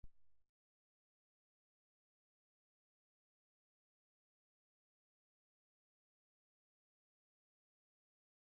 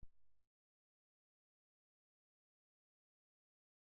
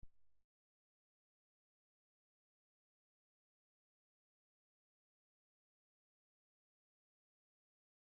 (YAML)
exhalation_length: 8.5 s
exhalation_amplitude: 197
exhalation_signal_mean_std_ratio: 0.15
cough_length: 3.9 s
cough_amplitude: 157
cough_signal_mean_std_ratio: 0.23
three_cough_length: 8.2 s
three_cough_amplitude: 145
three_cough_signal_mean_std_ratio: 0.15
survey_phase: beta (2021-08-13 to 2022-03-07)
age: 65+
gender: Male
wearing_mask: 'No'
symptom_none: true
smoker_status: Never smoked
respiratory_condition_asthma: false
respiratory_condition_other: false
recruitment_source: REACT
submission_delay: 1 day
covid_test_result: Negative
covid_test_method: RT-qPCR